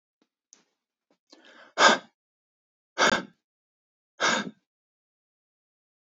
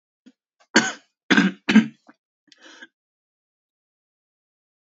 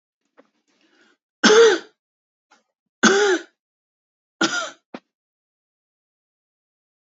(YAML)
exhalation_length: 6.1 s
exhalation_amplitude: 23684
exhalation_signal_mean_std_ratio: 0.24
cough_length: 4.9 s
cough_amplitude: 28927
cough_signal_mean_std_ratio: 0.24
three_cough_length: 7.1 s
three_cough_amplitude: 29259
three_cough_signal_mean_std_ratio: 0.28
survey_phase: beta (2021-08-13 to 2022-03-07)
age: 18-44
gender: Male
wearing_mask: 'No'
symptom_cough_any: true
symptom_runny_or_blocked_nose: true
symptom_shortness_of_breath: true
symptom_fatigue: true
symptom_headache: true
symptom_onset: 3 days
smoker_status: Never smoked
respiratory_condition_asthma: false
respiratory_condition_other: false
recruitment_source: Test and Trace
submission_delay: 2 days
covid_test_result: Positive
covid_test_method: RT-qPCR
covid_ct_value: 17.3
covid_ct_gene: ORF1ab gene
covid_ct_mean: 17.9
covid_viral_load: 1300000 copies/ml
covid_viral_load_category: High viral load (>1M copies/ml)